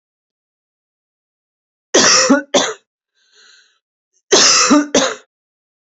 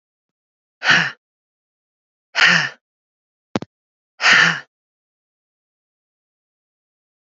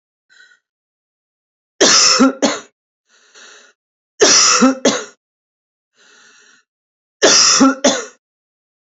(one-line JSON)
{"cough_length": "5.9 s", "cough_amplitude": 32768, "cough_signal_mean_std_ratio": 0.4, "exhalation_length": "7.3 s", "exhalation_amplitude": 30012, "exhalation_signal_mean_std_ratio": 0.28, "three_cough_length": "9.0 s", "three_cough_amplitude": 32768, "three_cough_signal_mean_std_ratio": 0.41, "survey_phase": "alpha (2021-03-01 to 2021-08-12)", "age": "18-44", "gender": "Female", "wearing_mask": "No", "symptom_none": true, "smoker_status": "Never smoked", "respiratory_condition_asthma": false, "respiratory_condition_other": false, "recruitment_source": "Test and Trace", "submission_delay": "0 days", "covid_test_result": "Negative", "covid_test_method": "LFT"}